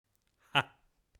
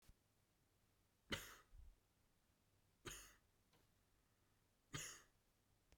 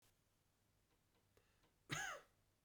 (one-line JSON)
{"exhalation_length": "1.2 s", "exhalation_amplitude": 10337, "exhalation_signal_mean_std_ratio": 0.18, "three_cough_length": "6.0 s", "three_cough_amplitude": 876, "three_cough_signal_mean_std_ratio": 0.34, "cough_length": "2.6 s", "cough_amplitude": 926, "cough_signal_mean_std_ratio": 0.31, "survey_phase": "beta (2021-08-13 to 2022-03-07)", "age": "18-44", "gender": "Male", "wearing_mask": "No", "symptom_none": true, "smoker_status": "Never smoked", "respiratory_condition_asthma": false, "respiratory_condition_other": false, "recruitment_source": "REACT", "submission_delay": "3 days", "covid_test_result": "Negative", "covid_test_method": "RT-qPCR", "influenza_a_test_result": "Negative", "influenza_b_test_result": "Negative"}